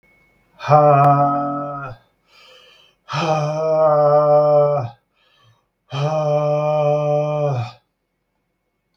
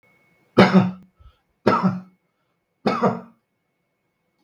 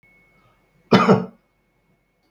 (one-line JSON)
{"exhalation_length": "9.0 s", "exhalation_amplitude": 32766, "exhalation_signal_mean_std_ratio": 0.66, "three_cough_length": "4.4 s", "three_cough_amplitude": 32767, "three_cough_signal_mean_std_ratio": 0.34, "cough_length": "2.3 s", "cough_amplitude": 32766, "cough_signal_mean_std_ratio": 0.28, "survey_phase": "beta (2021-08-13 to 2022-03-07)", "age": "45-64", "gender": "Male", "wearing_mask": "No", "symptom_none": true, "smoker_status": "Ex-smoker", "respiratory_condition_asthma": false, "respiratory_condition_other": false, "recruitment_source": "REACT", "submission_delay": "2 days", "covid_test_result": "Negative", "covid_test_method": "RT-qPCR", "influenza_a_test_result": "Negative", "influenza_b_test_result": "Negative"}